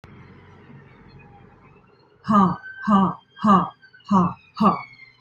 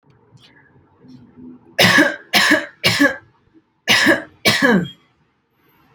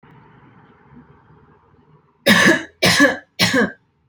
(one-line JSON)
{"exhalation_length": "5.2 s", "exhalation_amplitude": 20552, "exhalation_signal_mean_std_ratio": 0.43, "cough_length": "5.9 s", "cough_amplitude": 32767, "cough_signal_mean_std_ratio": 0.45, "three_cough_length": "4.1 s", "three_cough_amplitude": 31450, "three_cough_signal_mean_std_ratio": 0.41, "survey_phase": "alpha (2021-03-01 to 2021-08-12)", "age": "18-44", "gender": "Female", "wearing_mask": "No", "symptom_fatigue": true, "smoker_status": "Current smoker (1 to 10 cigarettes per day)", "respiratory_condition_asthma": false, "respiratory_condition_other": false, "recruitment_source": "REACT", "submission_delay": "2 days", "covid_test_result": "Negative", "covid_test_method": "RT-qPCR"}